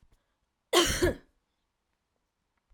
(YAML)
cough_length: 2.7 s
cough_amplitude: 13060
cough_signal_mean_std_ratio: 0.3
survey_phase: alpha (2021-03-01 to 2021-08-12)
age: 45-64
gender: Female
wearing_mask: 'No'
symptom_none: true
symptom_onset: 12 days
smoker_status: Never smoked
respiratory_condition_asthma: false
respiratory_condition_other: false
recruitment_source: REACT
submission_delay: 2 days
covid_test_result: Negative
covid_test_method: RT-qPCR